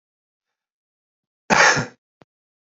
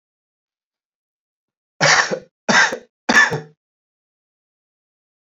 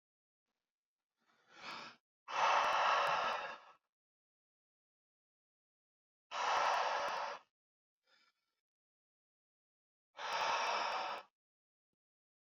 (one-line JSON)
{"cough_length": "2.7 s", "cough_amplitude": 27710, "cough_signal_mean_std_ratio": 0.27, "three_cough_length": "5.3 s", "three_cough_amplitude": 29345, "three_cough_signal_mean_std_ratio": 0.31, "exhalation_length": "12.5 s", "exhalation_amplitude": 2880, "exhalation_signal_mean_std_ratio": 0.43, "survey_phase": "beta (2021-08-13 to 2022-03-07)", "age": "18-44", "gender": "Male", "wearing_mask": "No", "symptom_runny_or_blocked_nose": true, "smoker_status": "Current smoker (e-cigarettes or vapes only)", "respiratory_condition_asthma": false, "respiratory_condition_other": false, "recruitment_source": "REACT", "submission_delay": "8 days", "covid_test_result": "Negative", "covid_test_method": "RT-qPCR"}